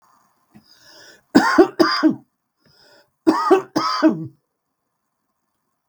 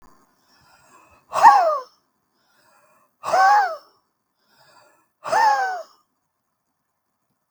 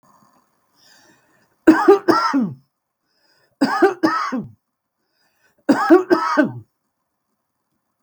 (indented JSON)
{
  "cough_length": "5.9 s",
  "cough_amplitude": 32767,
  "cough_signal_mean_std_ratio": 0.37,
  "exhalation_length": "7.5 s",
  "exhalation_amplitude": 32766,
  "exhalation_signal_mean_std_ratio": 0.34,
  "three_cough_length": "8.0 s",
  "three_cough_amplitude": 32768,
  "three_cough_signal_mean_std_ratio": 0.38,
  "survey_phase": "beta (2021-08-13 to 2022-03-07)",
  "age": "65+",
  "gender": "Female",
  "wearing_mask": "No",
  "symptom_shortness_of_breath": true,
  "smoker_status": "Ex-smoker",
  "respiratory_condition_asthma": true,
  "respiratory_condition_other": false,
  "recruitment_source": "REACT",
  "submission_delay": "2 days",
  "covid_test_result": "Negative",
  "covid_test_method": "RT-qPCR"
}